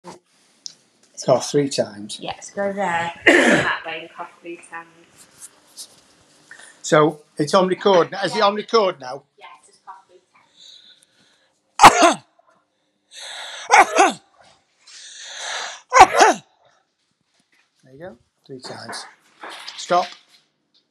{"three_cough_length": "20.9 s", "three_cough_amplitude": 32768, "three_cough_signal_mean_std_ratio": 0.36, "survey_phase": "beta (2021-08-13 to 2022-03-07)", "age": "45-64", "gender": "Male", "wearing_mask": "No", "symptom_cough_any": true, "symptom_runny_or_blocked_nose": true, "symptom_fatigue": true, "symptom_headache": true, "smoker_status": "Never smoked", "respiratory_condition_asthma": true, "respiratory_condition_other": false, "recruitment_source": "Test and Trace", "submission_delay": "3 days", "covid_test_result": "Positive", "covid_test_method": "RT-qPCR", "covid_ct_value": 25.6, "covid_ct_gene": "S gene", "covid_ct_mean": 26.3, "covid_viral_load": "2400 copies/ml", "covid_viral_load_category": "Minimal viral load (< 10K copies/ml)"}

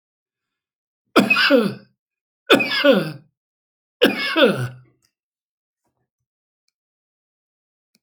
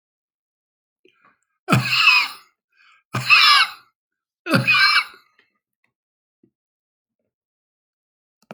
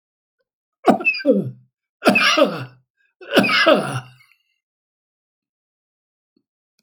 {"three_cough_length": "8.0 s", "three_cough_amplitude": 29451, "three_cough_signal_mean_std_ratio": 0.34, "exhalation_length": "8.5 s", "exhalation_amplitude": 29275, "exhalation_signal_mean_std_ratio": 0.35, "cough_length": "6.8 s", "cough_amplitude": 31859, "cough_signal_mean_std_ratio": 0.39, "survey_phase": "alpha (2021-03-01 to 2021-08-12)", "age": "65+", "gender": "Male", "wearing_mask": "No", "symptom_none": true, "smoker_status": "Ex-smoker", "respiratory_condition_asthma": true, "respiratory_condition_other": true, "recruitment_source": "REACT", "submission_delay": "4 days", "covid_test_result": "Negative", "covid_test_method": "RT-qPCR"}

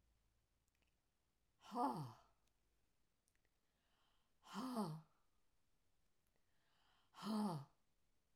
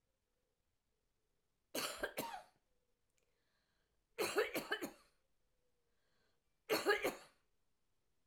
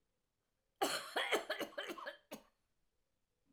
{"exhalation_length": "8.4 s", "exhalation_amplitude": 874, "exhalation_signal_mean_std_ratio": 0.35, "three_cough_length": "8.3 s", "three_cough_amplitude": 2573, "three_cough_signal_mean_std_ratio": 0.32, "cough_length": "3.5 s", "cough_amplitude": 3110, "cough_signal_mean_std_ratio": 0.42, "survey_phase": "alpha (2021-03-01 to 2021-08-12)", "age": "65+", "gender": "Female", "wearing_mask": "No", "symptom_cough_any": true, "symptom_new_continuous_cough": true, "symptom_diarrhoea": true, "symptom_fever_high_temperature": true, "symptom_loss_of_taste": true, "symptom_onset": "6 days", "smoker_status": "Never smoked", "respiratory_condition_asthma": false, "respiratory_condition_other": false, "recruitment_source": "Test and Trace", "submission_delay": "1 day", "covid_test_result": "Positive", "covid_test_method": "RT-qPCR", "covid_ct_value": 18.2, "covid_ct_gene": "ORF1ab gene"}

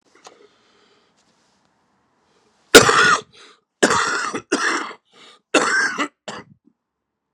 {"cough_length": "7.3 s", "cough_amplitude": 32768, "cough_signal_mean_std_ratio": 0.35, "survey_phase": "beta (2021-08-13 to 2022-03-07)", "age": "45-64", "gender": "Male", "wearing_mask": "No", "symptom_cough_any": true, "symptom_shortness_of_breath": true, "symptom_fatigue": true, "smoker_status": "Current smoker (11 or more cigarettes per day)", "respiratory_condition_asthma": false, "respiratory_condition_other": false, "recruitment_source": "Test and Trace", "submission_delay": "1 day", "covid_test_result": "Negative", "covid_test_method": "RT-qPCR"}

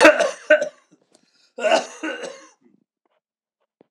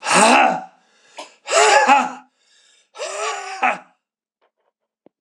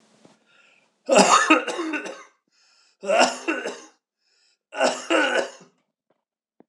{"cough_length": "3.9 s", "cough_amplitude": 26028, "cough_signal_mean_std_ratio": 0.33, "exhalation_length": "5.2 s", "exhalation_amplitude": 26028, "exhalation_signal_mean_std_ratio": 0.46, "three_cough_length": "6.7 s", "three_cough_amplitude": 26028, "three_cough_signal_mean_std_ratio": 0.42, "survey_phase": "alpha (2021-03-01 to 2021-08-12)", "age": "65+", "gender": "Male", "wearing_mask": "No", "symptom_cough_any": true, "symptom_fatigue": true, "symptom_fever_high_temperature": true, "symptom_headache": true, "symptom_onset": "3 days", "smoker_status": "Never smoked", "respiratory_condition_asthma": false, "respiratory_condition_other": false, "recruitment_source": "Test and Trace", "submission_delay": "2 days", "covid_test_result": "Positive", "covid_test_method": "RT-qPCR", "covid_ct_value": 18.5, "covid_ct_gene": "ORF1ab gene"}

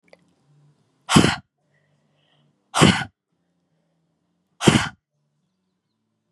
{"exhalation_length": "6.3 s", "exhalation_amplitude": 32610, "exhalation_signal_mean_std_ratio": 0.25, "survey_phase": "beta (2021-08-13 to 2022-03-07)", "age": "18-44", "gender": "Female", "wearing_mask": "No", "symptom_cough_any": true, "symptom_runny_or_blocked_nose": true, "symptom_change_to_sense_of_smell_or_taste": true, "symptom_onset": "4 days", "smoker_status": "Never smoked", "respiratory_condition_asthma": true, "respiratory_condition_other": false, "recruitment_source": "Test and Trace", "submission_delay": "2 days", "covid_test_result": "Positive", "covid_test_method": "RT-qPCR", "covid_ct_value": 23.0, "covid_ct_gene": "N gene"}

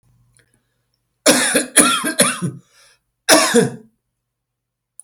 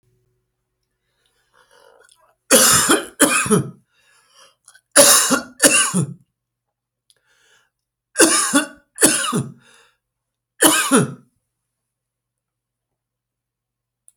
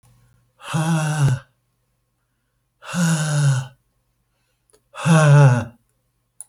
{"cough_length": "5.0 s", "cough_amplitude": 32768, "cough_signal_mean_std_ratio": 0.41, "three_cough_length": "14.2 s", "three_cough_amplitude": 32768, "three_cough_signal_mean_std_ratio": 0.37, "exhalation_length": "6.5 s", "exhalation_amplitude": 22723, "exhalation_signal_mean_std_ratio": 0.48, "survey_phase": "beta (2021-08-13 to 2022-03-07)", "age": "45-64", "gender": "Male", "wearing_mask": "No", "symptom_none": true, "smoker_status": "Never smoked", "respiratory_condition_asthma": false, "respiratory_condition_other": false, "recruitment_source": "REACT", "submission_delay": "1 day", "covid_test_result": "Negative", "covid_test_method": "RT-qPCR"}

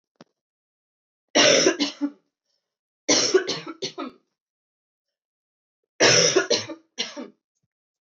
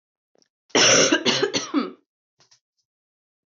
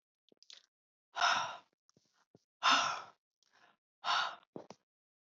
{"three_cough_length": "8.2 s", "three_cough_amplitude": 19151, "three_cough_signal_mean_std_ratio": 0.37, "cough_length": "3.5 s", "cough_amplitude": 18633, "cough_signal_mean_std_ratio": 0.41, "exhalation_length": "5.3 s", "exhalation_amplitude": 4976, "exhalation_signal_mean_std_ratio": 0.34, "survey_phase": "beta (2021-08-13 to 2022-03-07)", "age": "18-44", "gender": "Female", "wearing_mask": "No", "symptom_cough_any": true, "symptom_runny_or_blocked_nose": true, "symptom_sore_throat": true, "symptom_abdominal_pain": true, "symptom_fatigue": true, "symptom_fever_high_temperature": true, "symptom_headache": true, "symptom_other": true, "symptom_onset": "3 days", "smoker_status": "Current smoker (1 to 10 cigarettes per day)", "respiratory_condition_asthma": false, "respiratory_condition_other": false, "recruitment_source": "Test and Trace", "submission_delay": "1 day", "covid_test_result": "Positive", "covid_test_method": "RT-qPCR", "covid_ct_value": 21.3, "covid_ct_gene": "N gene"}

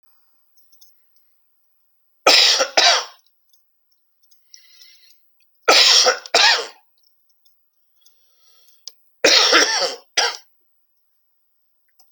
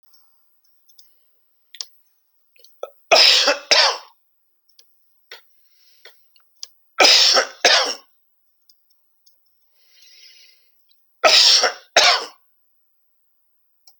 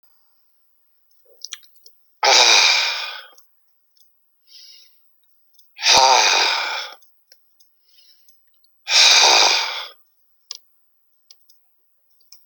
{"three_cough_length": "12.1 s", "three_cough_amplitude": 32768, "three_cough_signal_mean_std_ratio": 0.35, "cough_length": "14.0 s", "cough_amplitude": 32768, "cough_signal_mean_std_ratio": 0.32, "exhalation_length": "12.5 s", "exhalation_amplitude": 32767, "exhalation_signal_mean_std_ratio": 0.38, "survey_phase": "alpha (2021-03-01 to 2021-08-12)", "age": "65+", "gender": "Male", "wearing_mask": "No", "symptom_none": true, "smoker_status": "Current smoker (1 to 10 cigarettes per day)", "respiratory_condition_asthma": false, "respiratory_condition_other": false, "recruitment_source": "REACT", "submission_delay": "2 days", "covid_test_result": "Negative", "covid_test_method": "RT-qPCR"}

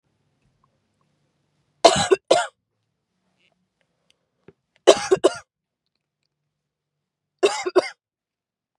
{"three_cough_length": "8.8 s", "three_cough_amplitude": 32768, "three_cough_signal_mean_std_ratio": 0.23, "survey_phase": "beta (2021-08-13 to 2022-03-07)", "age": "18-44", "gender": "Female", "wearing_mask": "No", "symptom_none": true, "smoker_status": "Ex-smoker", "respiratory_condition_asthma": true, "respiratory_condition_other": false, "recruitment_source": "REACT", "submission_delay": "4 days", "covid_test_result": "Negative", "covid_test_method": "RT-qPCR"}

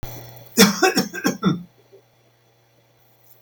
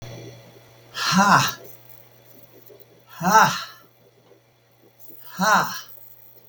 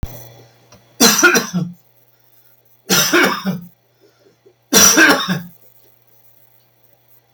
{"cough_length": "3.4 s", "cough_amplitude": 32768, "cough_signal_mean_std_ratio": 0.37, "exhalation_length": "6.5 s", "exhalation_amplitude": 27802, "exhalation_signal_mean_std_ratio": 0.39, "three_cough_length": "7.3 s", "three_cough_amplitude": 32768, "three_cough_signal_mean_std_ratio": 0.42, "survey_phase": "beta (2021-08-13 to 2022-03-07)", "age": "65+", "gender": "Male", "wearing_mask": "No", "symptom_none": true, "smoker_status": "Never smoked", "respiratory_condition_asthma": false, "respiratory_condition_other": false, "recruitment_source": "REACT", "submission_delay": "1 day", "covid_test_result": "Negative", "covid_test_method": "RT-qPCR"}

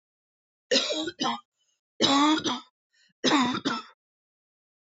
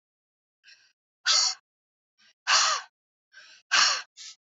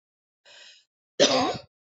{"three_cough_length": "4.9 s", "three_cough_amplitude": 17246, "three_cough_signal_mean_std_ratio": 0.47, "exhalation_length": "4.5 s", "exhalation_amplitude": 11433, "exhalation_signal_mean_std_ratio": 0.37, "cough_length": "1.9 s", "cough_amplitude": 18891, "cough_signal_mean_std_ratio": 0.35, "survey_phase": "beta (2021-08-13 to 2022-03-07)", "age": "18-44", "gender": "Female", "wearing_mask": "No", "symptom_cough_any": true, "symptom_runny_or_blocked_nose": true, "symptom_sore_throat": true, "symptom_headache": true, "symptom_onset": "5 days", "smoker_status": "Never smoked", "respiratory_condition_asthma": false, "respiratory_condition_other": false, "recruitment_source": "Test and Trace", "submission_delay": "2 days", "covid_test_result": "Positive", "covid_test_method": "ePCR"}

